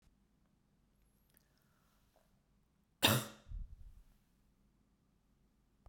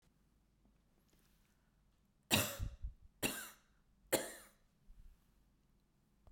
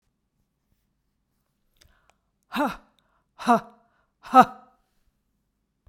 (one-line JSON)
{"cough_length": "5.9 s", "cough_amplitude": 5762, "cough_signal_mean_std_ratio": 0.2, "three_cough_length": "6.3 s", "three_cough_amplitude": 5000, "three_cough_signal_mean_std_ratio": 0.29, "exhalation_length": "5.9 s", "exhalation_amplitude": 30813, "exhalation_signal_mean_std_ratio": 0.19, "survey_phase": "beta (2021-08-13 to 2022-03-07)", "age": "45-64", "gender": "Female", "wearing_mask": "No", "symptom_none": true, "smoker_status": "Never smoked", "respiratory_condition_asthma": false, "respiratory_condition_other": false, "recruitment_source": "REACT", "submission_delay": "1 day", "covid_test_result": "Negative", "covid_test_method": "RT-qPCR"}